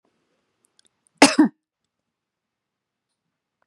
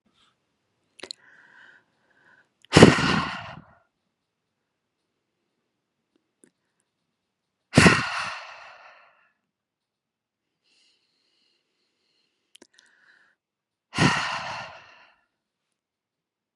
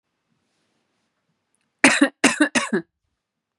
cough_length: 3.7 s
cough_amplitude: 32768
cough_signal_mean_std_ratio: 0.17
exhalation_length: 16.6 s
exhalation_amplitude: 32768
exhalation_signal_mean_std_ratio: 0.2
three_cough_length: 3.6 s
three_cough_amplitude: 31796
three_cough_signal_mean_std_ratio: 0.3
survey_phase: beta (2021-08-13 to 2022-03-07)
age: 18-44
gender: Female
wearing_mask: 'No'
symptom_none: true
smoker_status: Never smoked
respiratory_condition_asthma: false
respiratory_condition_other: false
recruitment_source: REACT
submission_delay: 3 days
covid_test_result: Negative
covid_test_method: RT-qPCR
influenza_a_test_result: Negative
influenza_b_test_result: Negative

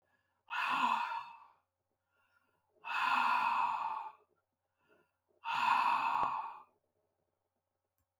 exhalation_length: 8.2 s
exhalation_amplitude: 3797
exhalation_signal_mean_std_ratio: 0.52
survey_phase: beta (2021-08-13 to 2022-03-07)
age: 65+
gender: Male
wearing_mask: 'No'
symptom_none: true
smoker_status: Never smoked
respiratory_condition_asthma: false
respiratory_condition_other: false
recruitment_source: REACT
submission_delay: 2 days
covid_test_result: Negative
covid_test_method: RT-qPCR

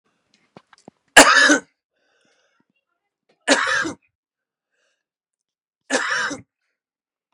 three_cough_length: 7.3 s
three_cough_amplitude: 32768
three_cough_signal_mean_std_ratio: 0.28
survey_phase: beta (2021-08-13 to 2022-03-07)
age: 45-64
gender: Male
wearing_mask: 'No'
symptom_none: true
smoker_status: Ex-smoker
respiratory_condition_asthma: true
respiratory_condition_other: false
recruitment_source: REACT
submission_delay: 3 days
covid_test_result: Negative
covid_test_method: RT-qPCR
influenza_a_test_result: Negative
influenza_b_test_result: Negative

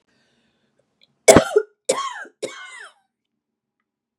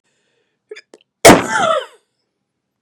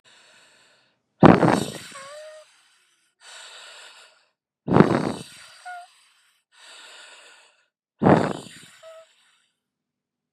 three_cough_length: 4.2 s
three_cough_amplitude: 32768
three_cough_signal_mean_std_ratio: 0.24
cough_length: 2.8 s
cough_amplitude: 32768
cough_signal_mean_std_ratio: 0.3
exhalation_length: 10.3 s
exhalation_amplitude: 32768
exhalation_signal_mean_std_ratio: 0.26
survey_phase: beta (2021-08-13 to 2022-03-07)
age: 45-64
gender: Female
wearing_mask: 'No'
symptom_sore_throat: true
symptom_change_to_sense_of_smell_or_taste: true
smoker_status: Never smoked
respiratory_condition_asthma: false
respiratory_condition_other: false
recruitment_source: REACT
submission_delay: 2 days
covid_test_result: Negative
covid_test_method: RT-qPCR
influenza_a_test_result: Negative
influenza_b_test_result: Negative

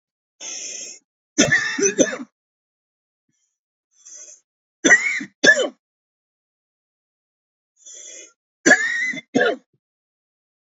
three_cough_length: 10.7 s
three_cough_amplitude: 28550
three_cough_signal_mean_std_ratio: 0.34
survey_phase: alpha (2021-03-01 to 2021-08-12)
age: 45-64
gender: Male
wearing_mask: 'No'
symptom_none: true
smoker_status: Never smoked
respiratory_condition_asthma: false
respiratory_condition_other: false
recruitment_source: REACT
submission_delay: 0 days
covid_test_result: Negative
covid_test_method: RT-qPCR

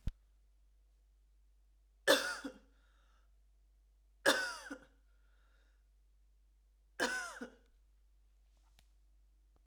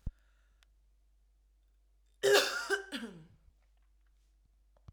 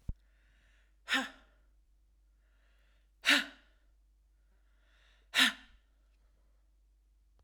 three_cough_length: 9.7 s
three_cough_amplitude: 8002
three_cough_signal_mean_std_ratio: 0.27
cough_length: 4.9 s
cough_amplitude: 8466
cough_signal_mean_std_ratio: 0.29
exhalation_length: 7.4 s
exhalation_amplitude: 7841
exhalation_signal_mean_std_ratio: 0.23
survey_phase: alpha (2021-03-01 to 2021-08-12)
age: 18-44
gender: Female
wearing_mask: 'No'
symptom_none: true
symptom_onset: 2 days
smoker_status: Ex-smoker
respiratory_condition_asthma: false
respiratory_condition_other: false
recruitment_source: REACT
submission_delay: 1 day
covid_test_result: Negative
covid_test_method: RT-qPCR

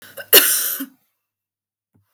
cough_length: 2.1 s
cough_amplitude: 32768
cough_signal_mean_std_ratio: 0.33
survey_phase: beta (2021-08-13 to 2022-03-07)
age: 45-64
gender: Female
wearing_mask: 'No'
symptom_none: true
smoker_status: Never smoked
respiratory_condition_asthma: false
respiratory_condition_other: false
recruitment_source: REACT
submission_delay: 2 days
covid_test_result: Negative
covid_test_method: RT-qPCR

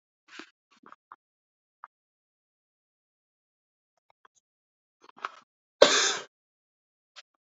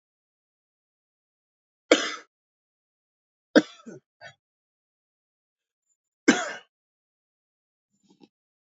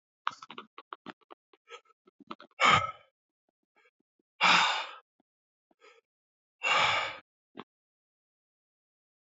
cough_length: 7.6 s
cough_amplitude: 29377
cough_signal_mean_std_ratio: 0.15
three_cough_length: 8.7 s
three_cough_amplitude: 26309
three_cough_signal_mean_std_ratio: 0.15
exhalation_length: 9.4 s
exhalation_amplitude: 10739
exhalation_signal_mean_std_ratio: 0.29
survey_phase: beta (2021-08-13 to 2022-03-07)
age: 18-44
gender: Male
wearing_mask: 'No'
symptom_cough_any: true
symptom_shortness_of_breath: true
symptom_fatigue: true
symptom_headache: true
symptom_change_to_sense_of_smell_or_taste: true
symptom_onset: 4 days
smoker_status: Ex-smoker
respiratory_condition_asthma: false
respiratory_condition_other: false
recruitment_source: Test and Trace
submission_delay: 1 day
covid_test_result: Positive
covid_test_method: RT-qPCR
covid_ct_value: 16.3
covid_ct_gene: N gene
covid_ct_mean: 17.3
covid_viral_load: 2100000 copies/ml
covid_viral_load_category: High viral load (>1M copies/ml)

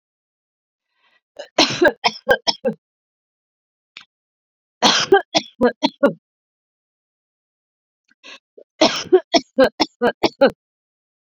three_cough_length: 11.3 s
three_cough_amplitude: 32767
three_cough_signal_mean_std_ratio: 0.31
survey_phase: beta (2021-08-13 to 2022-03-07)
age: 45-64
gender: Female
wearing_mask: 'No'
symptom_none: true
smoker_status: Never smoked
respiratory_condition_asthma: false
respiratory_condition_other: false
recruitment_source: REACT
submission_delay: 1 day
covid_test_result: Negative
covid_test_method: RT-qPCR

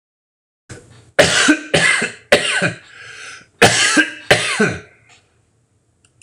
cough_length: 6.2 s
cough_amplitude: 26028
cough_signal_mean_std_ratio: 0.48
survey_phase: alpha (2021-03-01 to 2021-08-12)
age: 45-64
gender: Male
wearing_mask: 'No'
symptom_none: true
smoker_status: Current smoker (1 to 10 cigarettes per day)
respiratory_condition_asthma: false
respiratory_condition_other: false
recruitment_source: REACT
submission_delay: 2 days
covid_test_result: Negative
covid_test_method: RT-qPCR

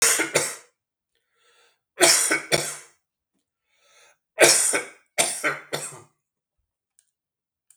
three_cough_length: 7.8 s
three_cough_amplitude: 32766
three_cough_signal_mean_std_ratio: 0.37
survey_phase: beta (2021-08-13 to 2022-03-07)
age: 45-64
gender: Male
wearing_mask: 'No'
symptom_cough_any: true
symptom_headache: true
smoker_status: Ex-smoker
respiratory_condition_asthma: false
respiratory_condition_other: false
recruitment_source: REACT
submission_delay: 4 days
covid_test_result: Negative
covid_test_method: RT-qPCR
influenza_a_test_result: Negative
influenza_b_test_result: Negative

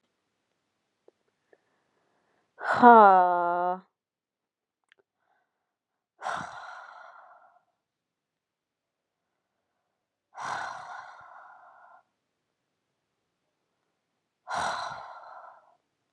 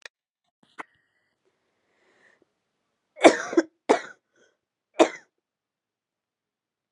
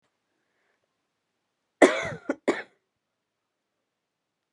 exhalation_length: 16.1 s
exhalation_amplitude: 25083
exhalation_signal_mean_std_ratio: 0.21
three_cough_length: 6.9 s
three_cough_amplitude: 31857
three_cough_signal_mean_std_ratio: 0.17
cough_length: 4.5 s
cough_amplitude: 27207
cough_signal_mean_std_ratio: 0.19
survey_phase: beta (2021-08-13 to 2022-03-07)
age: 18-44
gender: Female
wearing_mask: 'No'
symptom_cough_any: true
symptom_runny_or_blocked_nose: true
symptom_onset: 11 days
smoker_status: Never smoked
respiratory_condition_asthma: false
respiratory_condition_other: false
recruitment_source: REACT
submission_delay: 1 day
covid_test_result: Negative
covid_test_method: RT-qPCR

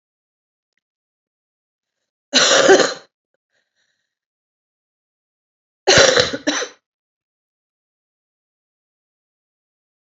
cough_length: 10.1 s
cough_amplitude: 32768
cough_signal_mean_std_ratio: 0.26
survey_phase: alpha (2021-03-01 to 2021-08-12)
age: 45-64
gender: Female
wearing_mask: 'No'
symptom_cough_any: true
symptom_shortness_of_breath: true
symptom_fatigue: true
symptom_headache: true
symptom_onset: 3 days
smoker_status: Ex-smoker
respiratory_condition_asthma: true
respiratory_condition_other: false
recruitment_source: Test and Trace
submission_delay: 1 day
covid_test_result: Positive
covid_test_method: RT-qPCR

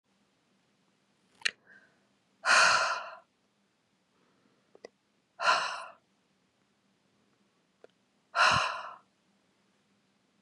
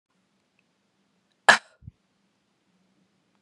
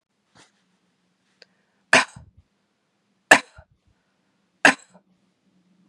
exhalation_length: 10.4 s
exhalation_amplitude: 9907
exhalation_signal_mean_std_ratio: 0.29
cough_length: 3.4 s
cough_amplitude: 32527
cough_signal_mean_std_ratio: 0.12
three_cough_length: 5.9 s
three_cough_amplitude: 32768
three_cough_signal_mean_std_ratio: 0.16
survey_phase: beta (2021-08-13 to 2022-03-07)
age: 45-64
gender: Female
wearing_mask: 'No'
symptom_none: true
smoker_status: Never smoked
respiratory_condition_asthma: false
respiratory_condition_other: false
recruitment_source: REACT
submission_delay: 2 days
covid_test_result: Negative
covid_test_method: RT-qPCR
influenza_a_test_result: Negative
influenza_b_test_result: Negative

